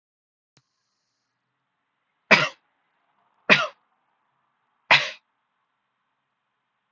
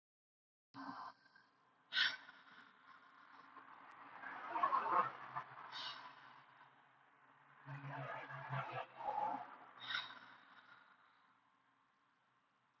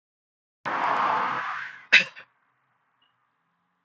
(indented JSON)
{
  "three_cough_length": "6.9 s",
  "three_cough_amplitude": 31595,
  "three_cough_signal_mean_std_ratio": 0.19,
  "exhalation_length": "12.8 s",
  "exhalation_amplitude": 2332,
  "exhalation_signal_mean_std_ratio": 0.45,
  "cough_length": "3.8 s",
  "cough_amplitude": 32427,
  "cough_signal_mean_std_ratio": 0.39,
  "survey_phase": "beta (2021-08-13 to 2022-03-07)",
  "age": "18-44",
  "gender": "Male",
  "wearing_mask": "No",
  "symptom_sore_throat": true,
  "smoker_status": "Never smoked",
  "respiratory_condition_asthma": false,
  "respiratory_condition_other": false,
  "recruitment_source": "Test and Trace",
  "submission_delay": "0 days",
  "covid_test_result": "Negative",
  "covid_test_method": "LFT"
}